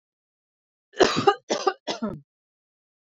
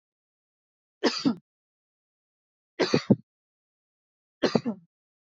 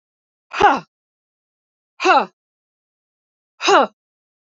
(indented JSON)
{
  "cough_length": "3.2 s",
  "cough_amplitude": 22303,
  "cough_signal_mean_std_ratio": 0.32,
  "three_cough_length": "5.4 s",
  "three_cough_amplitude": 16025,
  "three_cough_signal_mean_std_ratio": 0.25,
  "exhalation_length": "4.4 s",
  "exhalation_amplitude": 28809,
  "exhalation_signal_mean_std_ratio": 0.3,
  "survey_phase": "alpha (2021-03-01 to 2021-08-12)",
  "age": "45-64",
  "gender": "Female",
  "wearing_mask": "No",
  "symptom_none": true,
  "smoker_status": "Prefer not to say",
  "respiratory_condition_asthma": false,
  "respiratory_condition_other": false,
  "recruitment_source": "REACT",
  "submission_delay": "3 days",
  "covid_test_result": "Negative",
  "covid_test_method": "RT-qPCR"
}